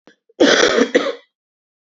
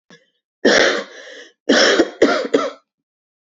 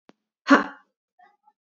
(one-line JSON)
{"cough_length": "2.0 s", "cough_amplitude": 28487, "cough_signal_mean_std_ratio": 0.46, "three_cough_length": "3.6 s", "three_cough_amplitude": 31228, "three_cough_signal_mean_std_ratio": 0.48, "exhalation_length": "1.8 s", "exhalation_amplitude": 26339, "exhalation_signal_mean_std_ratio": 0.21, "survey_phase": "beta (2021-08-13 to 2022-03-07)", "age": "18-44", "gender": "Female", "wearing_mask": "No", "symptom_cough_any": true, "symptom_fatigue": true, "symptom_headache": true, "smoker_status": "Ex-smoker", "respiratory_condition_asthma": true, "respiratory_condition_other": false, "recruitment_source": "Test and Trace", "submission_delay": "0 days", "covid_test_result": "Positive", "covid_test_method": "LFT"}